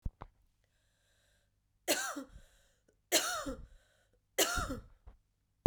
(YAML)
three_cough_length: 5.7 s
three_cough_amplitude: 7469
three_cough_signal_mean_std_ratio: 0.32
survey_phase: beta (2021-08-13 to 2022-03-07)
age: 18-44
gender: Female
wearing_mask: 'No'
symptom_cough_any: true
symptom_runny_or_blocked_nose: true
symptom_shortness_of_breath: true
symptom_fatigue: true
symptom_headache: true
symptom_onset: 2 days
smoker_status: Never smoked
respiratory_condition_asthma: false
respiratory_condition_other: false
recruitment_source: Test and Trace
submission_delay: 2 days
covid_test_result: Positive
covid_test_method: RT-qPCR
covid_ct_value: 22.4
covid_ct_gene: ORF1ab gene
covid_ct_mean: 23.0
covid_viral_load: 28000 copies/ml
covid_viral_load_category: Low viral load (10K-1M copies/ml)